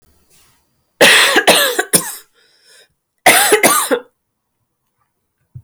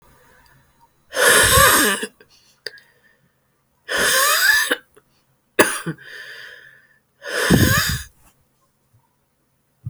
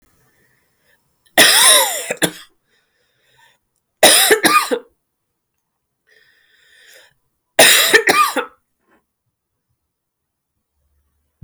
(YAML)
cough_length: 5.6 s
cough_amplitude: 32768
cough_signal_mean_std_ratio: 0.44
exhalation_length: 9.9 s
exhalation_amplitude: 32768
exhalation_signal_mean_std_ratio: 0.44
three_cough_length: 11.4 s
three_cough_amplitude: 32768
three_cough_signal_mean_std_ratio: 0.35
survey_phase: alpha (2021-03-01 to 2021-08-12)
age: 45-64
gender: Female
wearing_mask: 'No'
symptom_cough_any: true
symptom_fatigue: true
symptom_fever_high_temperature: true
symptom_headache: true
symptom_onset: 2 days
smoker_status: Never smoked
respiratory_condition_asthma: false
respiratory_condition_other: false
recruitment_source: Test and Trace
submission_delay: 1 day
covid_test_result: Positive
covid_test_method: RT-qPCR
covid_ct_value: 17.7
covid_ct_gene: ORF1ab gene
covid_ct_mean: 18.1
covid_viral_load: 1100000 copies/ml
covid_viral_load_category: High viral load (>1M copies/ml)